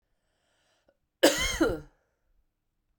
{"cough_length": "3.0 s", "cough_amplitude": 17505, "cough_signal_mean_std_ratio": 0.3, "survey_phase": "beta (2021-08-13 to 2022-03-07)", "age": "45-64", "gender": "Female", "wearing_mask": "No", "symptom_cough_any": true, "symptom_runny_or_blocked_nose": true, "symptom_sore_throat": true, "symptom_fatigue": true, "symptom_fever_high_temperature": true, "symptom_headache": true, "symptom_onset": "3 days", "smoker_status": "Ex-smoker", "respiratory_condition_asthma": false, "respiratory_condition_other": false, "recruitment_source": "Test and Trace", "submission_delay": "2 days", "covid_test_result": "Positive", "covid_test_method": "RT-qPCR", "covid_ct_value": 14.9, "covid_ct_gene": "ORF1ab gene", "covid_ct_mean": 15.4, "covid_viral_load": "8700000 copies/ml", "covid_viral_load_category": "High viral load (>1M copies/ml)"}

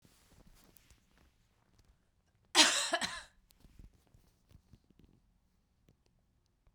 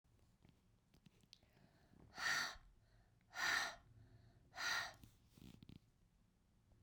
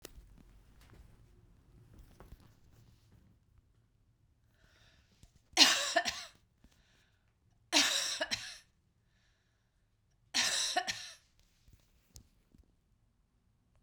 {"cough_length": "6.7 s", "cough_amplitude": 12795, "cough_signal_mean_std_ratio": 0.21, "exhalation_length": "6.8 s", "exhalation_amplitude": 1390, "exhalation_signal_mean_std_ratio": 0.38, "three_cough_length": "13.8 s", "three_cough_amplitude": 16031, "three_cough_signal_mean_std_ratio": 0.28, "survey_phase": "beta (2021-08-13 to 2022-03-07)", "age": "45-64", "gender": "Female", "wearing_mask": "No", "symptom_cough_any": true, "symptom_runny_or_blocked_nose": true, "symptom_sore_throat": true, "symptom_abdominal_pain": true, "symptom_fatigue": true, "symptom_headache": true, "symptom_change_to_sense_of_smell_or_taste": true, "symptom_onset": "8 days", "smoker_status": "Never smoked", "respiratory_condition_asthma": false, "respiratory_condition_other": false, "recruitment_source": "Test and Trace", "submission_delay": "2 days", "covid_test_result": "Positive", "covid_test_method": "RT-qPCR", "covid_ct_value": 20.6, "covid_ct_gene": "ORF1ab gene", "covid_ct_mean": 21.0, "covid_viral_load": "130000 copies/ml", "covid_viral_load_category": "Low viral load (10K-1M copies/ml)"}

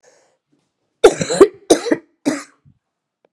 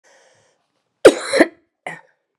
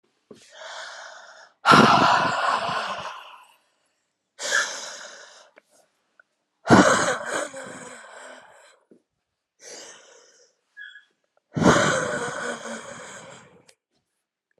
{"three_cough_length": "3.3 s", "three_cough_amplitude": 32768, "three_cough_signal_mean_std_ratio": 0.29, "cough_length": "2.4 s", "cough_amplitude": 32768, "cough_signal_mean_std_ratio": 0.24, "exhalation_length": "14.6 s", "exhalation_amplitude": 30016, "exhalation_signal_mean_std_ratio": 0.38, "survey_phase": "beta (2021-08-13 to 2022-03-07)", "age": "45-64", "gender": "Female", "wearing_mask": "No", "symptom_cough_any": true, "symptom_runny_or_blocked_nose": true, "symptom_shortness_of_breath": true, "symptom_onset": "2 days", "smoker_status": "Ex-smoker", "respiratory_condition_asthma": true, "respiratory_condition_other": false, "recruitment_source": "Test and Trace", "submission_delay": "1 day", "covid_test_result": "Positive", "covid_test_method": "RT-qPCR", "covid_ct_value": 25.5, "covid_ct_gene": "ORF1ab gene", "covid_ct_mean": 25.9, "covid_viral_load": "3300 copies/ml", "covid_viral_load_category": "Minimal viral load (< 10K copies/ml)"}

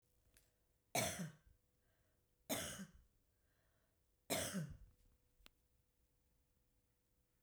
{"three_cough_length": "7.4 s", "three_cough_amplitude": 1695, "three_cough_signal_mean_std_ratio": 0.33, "survey_phase": "beta (2021-08-13 to 2022-03-07)", "age": "45-64", "gender": "Female", "wearing_mask": "No", "symptom_none": true, "smoker_status": "Never smoked", "respiratory_condition_asthma": false, "respiratory_condition_other": false, "recruitment_source": "REACT", "submission_delay": "3 days", "covid_test_result": "Negative", "covid_test_method": "RT-qPCR", "influenza_a_test_result": "Negative", "influenza_b_test_result": "Negative"}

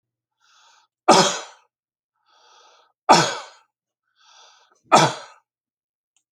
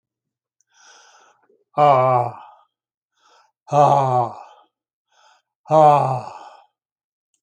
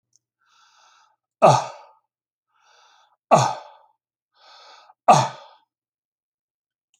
{"three_cough_length": "6.3 s", "three_cough_amplitude": 30799, "three_cough_signal_mean_std_ratio": 0.26, "exhalation_length": "7.4 s", "exhalation_amplitude": 27312, "exhalation_signal_mean_std_ratio": 0.37, "cough_length": "7.0 s", "cough_amplitude": 28635, "cough_signal_mean_std_ratio": 0.23, "survey_phase": "beta (2021-08-13 to 2022-03-07)", "age": "65+", "gender": "Male", "wearing_mask": "No", "symptom_none": true, "smoker_status": "Ex-smoker", "respiratory_condition_asthma": false, "respiratory_condition_other": false, "recruitment_source": "REACT", "submission_delay": "0 days", "covid_test_result": "Negative", "covid_test_method": "RT-qPCR"}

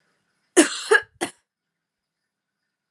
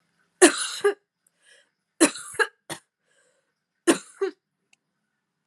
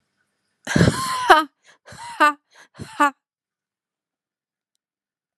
{"cough_length": "2.9 s", "cough_amplitude": 32222, "cough_signal_mean_std_ratio": 0.24, "three_cough_length": "5.5 s", "three_cough_amplitude": 31606, "three_cough_signal_mean_std_ratio": 0.26, "exhalation_length": "5.4 s", "exhalation_amplitude": 32767, "exhalation_signal_mean_std_ratio": 0.3, "survey_phase": "alpha (2021-03-01 to 2021-08-12)", "age": "18-44", "gender": "Female", "wearing_mask": "No", "symptom_fatigue": true, "symptom_fever_high_temperature": true, "symptom_headache": true, "smoker_status": "Never smoked", "respiratory_condition_asthma": false, "respiratory_condition_other": false, "recruitment_source": "Test and Trace", "submission_delay": "2 days", "covid_test_result": "Positive", "covid_test_method": "RT-qPCR", "covid_ct_value": 22.0, "covid_ct_gene": "ORF1ab gene"}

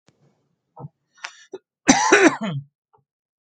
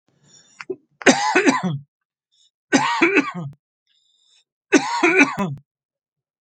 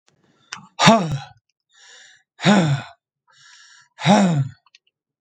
{"cough_length": "3.4 s", "cough_amplitude": 32767, "cough_signal_mean_std_ratio": 0.32, "three_cough_length": "6.4 s", "three_cough_amplitude": 32767, "three_cough_signal_mean_std_ratio": 0.43, "exhalation_length": "5.2 s", "exhalation_amplitude": 32767, "exhalation_signal_mean_std_ratio": 0.39, "survey_phase": "beta (2021-08-13 to 2022-03-07)", "age": "45-64", "gender": "Male", "wearing_mask": "No", "symptom_none": true, "smoker_status": "Never smoked", "respiratory_condition_asthma": false, "respiratory_condition_other": false, "recruitment_source": "REACT", "submission_delay": "1 day", "covid_test_result": "Negative", "covid_test_method": "RT-qPCR", "influenza_a_test_result": "Negative", "influenza_b_test_result": "Negative"}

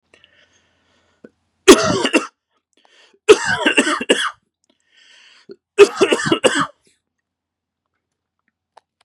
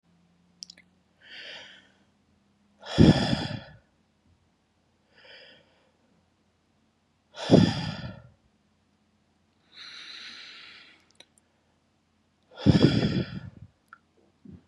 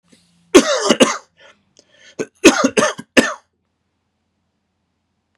{"three_cough_length": "9.0 s", "three_cough_amplitude": 32768, "three_cough_signal_mean_std_ratio": 0.31, "exhalation_length": "14.7 s", "exhalation_amplitude": 23191, "exhalation_signal_mean_std_ratio": 0.26, "cough_length": "5.4 s", "cough_amplitude": 32768, "cough_signal_mean_std_ratio": 0.32, "survey_phase": "beta (2021-08-13 to 2022-03-07)", "age": "45-64", "gender": "Male", "wearing_mask": "No", "symptom_cough_any": true, "symptom_sore_throat": true, "symptom_headache": true, "symptom_onset": "8 days", "smoker_status": "Never smoked", "respiratory_condition_asthma": false, "respiratory_condition_other": false, "recruitment_source": "REACT", "submission_delay": "1 day", "covid_test_result": "Negative", "covid_test_method": "RT-qPCR"}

